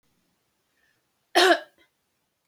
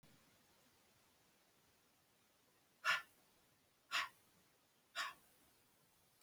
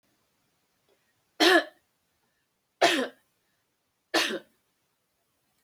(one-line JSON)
{"cough_length": "2.5 s", "cough_amplitude": 20252, "cough_signal_mean_std_ratio": 0.24, "exhalation_length": "6.2 s", "exhalation_amplitude": 1872, "exhalation_signal_mean_std_ratio": 0.25, "three_cough_length": "5.6 s", "three_cough_amplitude": 14866, "three_cough_signal_mean_std_ratio": 0.27, "survey_phase": "beta (2021-08-13 to 2022-03-07)", "age": "65+", "gender": "Female", "wearing_mask": "No", "symptom_none": true, "smoker_status": "Never smoked", "respiratory_condition_asthma": false, "respiratory_condition_other": false, "recruitment_source": "REACT", "submission_delay": "1 day", "covid_test_result": "Negative", "covid_test_method": "RT-qPCR"}